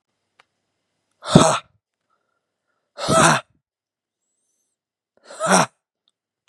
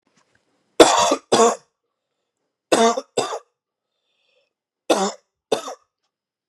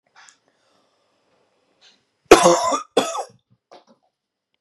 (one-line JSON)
{"exhalation_length": "6.5 s", "exhalation_amplitude": 32768, "exhalation_signal_mean_std_ratio": 0.28, "three_cough_length": "6.5 s", "three_cough_amplitude": 32768, "three_cough_signal_mean_std_ratio": 0.33, "cough_length": "4.6 s", "cough_amplitude": 32768, "cough_signal_mean_std_ratio": 0.26, "survey_phase": "beta (2021-08-13 to 2022-03-07)", "age": "18-44", "gender": "Male", "wearing_mask": "No", "symptom_none": true, "smoker_status": "Never smoked", "respiratory_condition_asthma": false, "respiratory_condition_other": false, "recruitment_source": "REACT", "submission_delay": "2 days", "covid_test_result": "Negative", "covid_test_method": "RT-qPCR", "influenza_a_test_result": "Negative", "influenza_b_test_result": "Negative"}